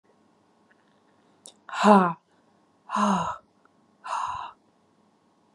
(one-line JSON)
{"exhalation_length": "5.5 s", "exhalation_amplitude": 22391, "exhalation_signal_mean_std_ratio": 0.31, "survey_phase": "beta (2021-08-13 to 2022-03-07)", "age": "45-64", "gender": "Female", "wearing_mask": "No", "symptom_none": true, "smoker_status": "Never smoked", "respiratory_condition_asthma": false, "respiratory_condition_other": false, "recruitment_source": "REACT", "submission_delay": "3 days", "covid_test_result": "Negative", "covid_test_method": "RT-qPCR"}